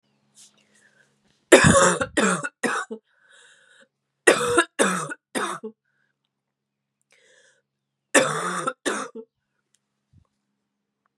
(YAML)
three_cough_length: 11.2 s
three_cough_amplitude: 32767
three_cough_signal_mean_std_ratio: 0.33
survey_phase: beta (2021-08-13 to 2022-03-07)
age: 45-64
gender: Female
wearing_mask: 'Yes'
symptom_runny_or_blocked_nose: true
symptom_shortness_of_breath: true
symptom_sore_throat: true
symptom_fatigue: true
symptom_onset: 5 days
smoker_status: Never smoked
respiratory_condition_asthma: false
respiratory_condition_other: false
recruitment_source: Test and Trace
submission_delay: 2 days
covid_test_result: Positive
covid_test_method: ePCR